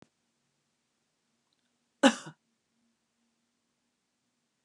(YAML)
cough_length: 4.6 s
cough_amplitude: 18069
cough_signal_mean_std_ratio: 0.12
survey_phase: beta (2021-08-13 to 2022-03-07)
age: 65+
gender: Female
wearing_mask: 'No'
symptom_none: true
smoker_status: Never smoked
respiratory_condition_asthma: false
respiratory_condition_other: false
recruitment_source: REACT
submission_delay: 1 day
covid_test_result: Negative
covid_test_method: RT-qPCR